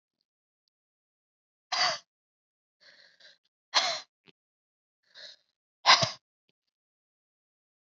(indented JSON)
{
  "exhalation_length": "7.9 s",
  "exhalation_amplitude": 16351,
  "exhalation_signal_mean_std_ratio": 0.21,
  "survey_phase": "beta (2021-08-13 to 2022-03-07)",
  "age": "18-44",
  "gender": "Female",
  "wearing_mask": "No",
  "symptom_cough_any": true,
  "symptom_runny_or_blocked_nose": true,
  "symptom_sore_throat": true,
  "symptom_fatigue": true,
  "symptom_headache": true,
  "symptom_onset": "4 days",
  "smoker_status": "Never smoked",
  "respiratory_condition_asthma": true,
  "respiratory_condition_other": false,
  "recruitment_source": "Test and Trace",
  "submission_delay": "1 day",
  "covid_test_result": "Positive",
  "covid_test_method": "RT-qPCR",
  "covid_ct_value": 31.0,
  "covid_ct_gene": "N gene"
}